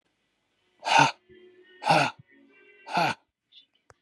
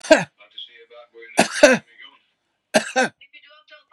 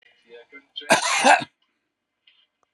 {"exhalation_length": "4.0 s", "exhalation_amplitude": 20163, "exhalation_signal_mean_std_ratio": 0.34, "three_cough_length": "3.9 s", "three_cough_amplitude": 32768, "three_cough_signal_mean_std_ratio": 0.31, "cough_length": "2.7 s", "cough_amplitude": 30402, "cough_signal_mean_std_ratio": 0.33, "survey_phase": "beta (2021-08-13 to 2022-03-07)", "age": "45-64", "gender": "Male", "wearing_mask": "Yes", "symptom_none": true, "smoker_status": "Never smoked", "respiratory_condition_asthma": false, "respiratory_condition_other": false, "recruitment_source": "REACT", "submission_delay": "6 days", "covid_test_result": "Negative", "covid_test_method": "RT-qPCR", "influenza_a_test_result": "Negative", "influenza_b_test_result": "Negative"}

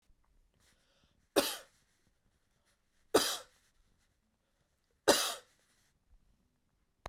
{"three_cough_length": "7.1 s", "three_cough_amplitude": 10118, "three_cough_signal_mean_std_ratio": 0.22, "survey_phase": "beta (2021-08-13 to 2022-03-07)", "age": "45-64", "gender": "Male", "wearing_mask": "No", "symptom_none": true, "symptom_onset": "7 days", "smoker_status": "Never smoked", "respiratory_condition_asthma": false, "respiratory_condition_other": false, "recruitment_source": "REACT", "submission_delay": "3 days", "covid_test_result": "Negative", "covid_test_method": "RT-qPCR"}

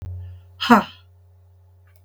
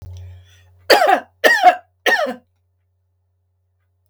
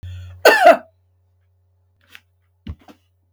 {"exhalation_length": "2.0 s", "exhalation_amplitude": 32766, "exhalation_signal_mean_std_ratio": 0.3, "three_cough_length": "4.1 s", "three_cough_amplitude": 32768, "three_cough_signal_mean_std_ratio": 0.38, "cough_length": "3.3 s", "cough_amplitude": 32768, "cough_signal_mean_std_ratio": 0.27, "survey_phase": "beta (2021-08-13 to 2022-03-07)", "age": "65+", "gender": "Female", "wearing_mask": "No", "symptom_none": true, "smoker_status": "Never smoked", "respiratory_condition_asthma": true, "respiratory_condition_other": false, "recruitment_source": "REACT", "submission_delay": "1 day", "covid_test_result": "Negative", "covid_test_method": "RT-qPCR", "influenza_a_test_result": "Negative", "influenza_b_test_result": "Negative"}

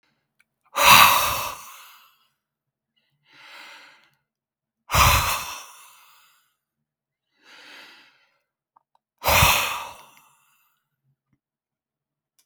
{"exhalation_length": "12.5 s", "exhalation_amplitude": 32768, "exhalation_signal_mean_std_ratio": 0.29, "survey_phase": "beta (2021-08-13 to 2022-03-07)", "age": "65+", "gender": "Male", "wearing_mask": "No", "symptom_fatigue": true, "smoker_status": "Ex-smoker", "respiratory_condition_asthma": false, "respiratory_condition_other": false, "recruitment_source": "REACT", "submission_delay": "2 days", "covid_test_result": "Negative", "covid_test_method": "RT-qPCR", "influenza_a_test_result": "Negative", "influenza_b_test_result": "Negative"}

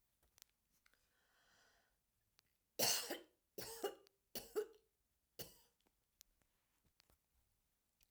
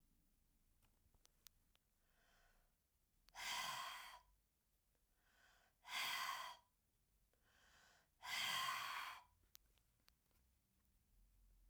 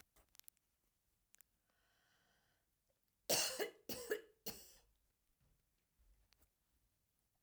{"three_cough_length": "8.1 s", "three_cough_amplitude": 2362, "three_cough_signal_mean_std_ratio": 0.25, "exhalation_length": "11.7 s", "exhalation_amplitude": 812, "exhalation_signal_mean_std_ratio": 0.4, "cough_length": "7.4 s", "cough_amplitude": 2556, "cough_signal_mean_std_ratio": 0.25, "survey_phase": "alpha (2021-03-01 to 2021-08-12)", "age": "65+", "gender": "Female", "wearing_mask": "No", "symptom_none": true, "smoker_status": "Never smoked", "respiratory_condition_asthma": false, "respiratory_condition_other": false, "recruitment_source": "REACT", "submission_delay": "2 days", "covid_test_result": "Negative", "covid_test_method": "RT-qPCR"}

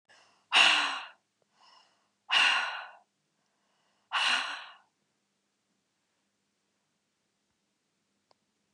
{"exhalation_length": "8.7 s", "exhalation_amplitude": 13252, "exhalation_signal_mean_std_ratio": 0.3, "survey_phase": "beta (2021-08-13 to 2022-03-07)", "age": "45-64", "gender": "Female", "wearing_mask": "No", "symptom_runny_or_blocked_nose": true, "smoker_status": "Never smoked", "respiratory_condition_asthma": false, "respiratory_condition_other": false, "recruitment_source": "Test and Trace", "submission_delay": "2 days", "covid_test_result": "Positive", "covid_test_method": "LFT"}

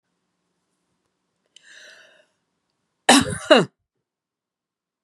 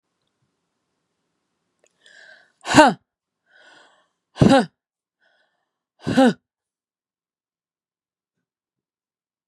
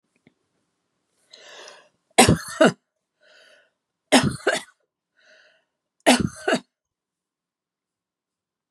{"cough_length": "5.0 s", "cough_amplitude": 31079, "cough_signal_mean_std_ratio": 0.21, "exhalation_length": "9.5 s", "exhalation_amplitude": 32767, "exhalation_signal_mean_std_ratio": 0.21, "three_cough_length": "8.7 s", "three_cough_amplitude": 31656, "three_cough_signal_mean_std_ratio": 0.25, "survey_phase": "beta (2021-08-13 to 2022-03-07)", "age": "65+", "gender": "Female", "wearing_mask": "No", "symptom_cough_any": true, "symptom_runny_or_blocked_nose": true, "symptom_fatigue": true, "symptom_onset": "12 days", "smoker_status": "Never smoked", "respiratory_condition_asthma": false, "respiratory_condition_other": false, "recruitment_source": "REACT", "submission_delay": "2 days", "covid_test_result": "Negative", "covid_test_method": "RT-qPCR", "influenza_a_test_result": "Negative", "influenza_b_test_result": "Negative"}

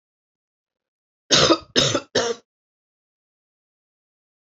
{"three_cough_length": "4.5 s", "three_cough_amplitude": 26238, "three_cough_signal_mean_std_ratio": 0.3, "survey_phase": "beta (2021-08-13 to 2022-03-07)", "age": "45-64", "gender": "Female", "wearing_mask": "No", "symptom_runny_or_blocked_nose": true, "symptom_sore_throat": true, "symptom_other": true, "smoker_status": "Ex-smoker", "respiratory_condition_asthma": false, "respiratory_condition_other": false, "recruitment_source": "Test and Trace", "submission_delay": "1 day", "covid_test_result": "Positive", "covid_test_method": "RT-qPCR", "covid_ct_value": 23.3, "covid_ct_gene": "N gene"}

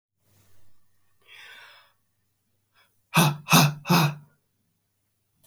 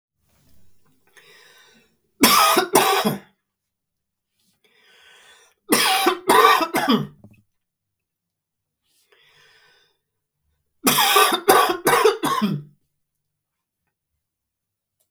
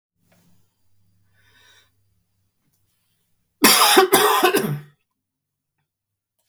{"exhalation_length": "5.5 s", "exhalation_amplitude": 20220, "exhalation_signal_mean_std_ratio": 0.3, "three_cough_length": "15.1 s", "three_cough_amplitude": 32768, "three_cough_signal_mean_std_ratio": 0.39, "cough_length": "6.5 s", "cough_amplitude": 32768, "cough_signal_mean_std_ratio": 0.32, "survey_phase": "beta (2021-08-13 to 2022-03-07)", "age": "45-64", "gender": "Male", "wearing_mask": "No", "symptom_runny_or_blocked_nose": true, "smoker_status": "Never smoked", "respiratory_condition_asthma": false, "respiratory_condition_other": false, "recruitment_source": "Test and Trace", "submission_delay": "2 days", "covid_test_result": "Positive", "covid_test_method": "RT-qPCR", "covid_ct_value": 32.6, "covid_ct_gene": "ORF1ab gene"}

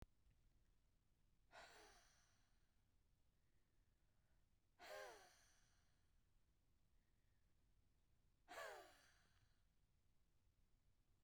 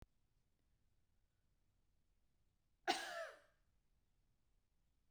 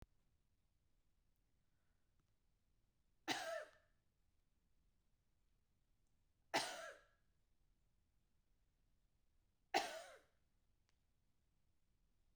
{"exhalation_length": "11.2 s", "exhalation_amplitude": 216, "exhalation_signal_mean_std_ratio": 0.49, "cough_length": "5.1 s", "cough_amplitude": 2022, "cough_signal_mean_std_ratio": 0.23, "three_cough_length": "12.4 s", "three_cough_amplitude": 1806, "three_cough_signal_mean_std_ratio": 0.24, "survey_phase": "beta (2021-08-13 to 2022-03-07)", "age": "45-64", "gender": "Female", "wearing_mask": "No", "symptom_none": true, "smoker_status": "Never smoked", "respiratory_condition_asthma": false, "respiratory_condition_other": false, "recruitment_source": "REACT", "submission_delay": "2 days", "covid_test_result": "Negative", "covid_test_method": "RT-qPCR", "influenza_a_test_result": "Negative", "influenza_b_test_result": "Negative"}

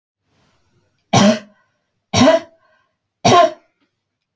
{"three_cough_length": "4.4 s", "three_cough_amplitude": 29001, "three_cough_signal_mean_std_ratio": 0.35, "survey_phase": "beta (2021-08-13 to 2022-03-07)", "age": "45-64", "gender": "Female", "wearing_mask": "No", "symptom_none": true, "smoker_status": "Never smoked", "respiratory_condition_asthma": false, "respiratory_condition_other": false, "recruitment_source": "REACT", "submission_delay": "4 days", "covid_test_result": "Negative", "covid_test_method": "RT-qPCR"}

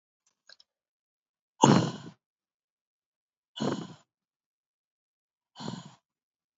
{"exhalation_length": "6.6 s", "exhalation_amplitude": 23887, "exhalation_signal_mean_std_ratio": 0.21, "survey_phase": "beta (2021-08-13 to 2022-03-07)", "age": "45-64", "gender": "Female", "wearing_mask": "No", "symptom_cough_any": true, "symptom_new_continuous_cough": true, "symptom_runny_or_blocked_nose": true, "symptom_headache": true, "smoker_status": "Never smoked", "respiratory_condition_asthma": false, "respiratory_condition_other": false, "recruitment_source": "Test and Trace", "submission_delay": "2 days", "covid_test_result": "Positive", "covid_test_method": "ePCR"}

